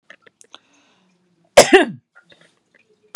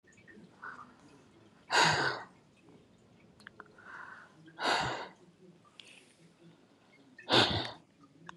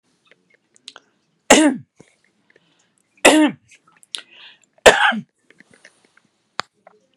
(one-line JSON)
{"cough_length": "3.2 s", "cough_amplitude": 32768, "cough_signal_mean_std_ratio": 0.22, "exhalation_length": "8.4 s", "exhalation_amplitude": 9271, "exhalation_signal_mean_std_ratio": 0.35, "three_cough_length": "7.2 s", "three_cough_amplitude": 32768, "three_cough_signal_mean_std_ratio": 0.26, "survey_phase": "beta (2021-08-13 to 2022-03-07)", "age": "45-64", "gender": "Female", "wearing_mask": "No", "symptom_none": true, "smoker_status": "Current smoker (11 or more cigarettes per day)", "respiratory_condition_asthma": false, "respiratory_condition_other": false, "recruitment_source": "REACT", "submission_delay": "2 days", "covid_test_result": "Negative", "covid_test_method": "RT-qPCR", "influenza_a_test_result": "Negative", "influenza_b_test_result": "Negative"}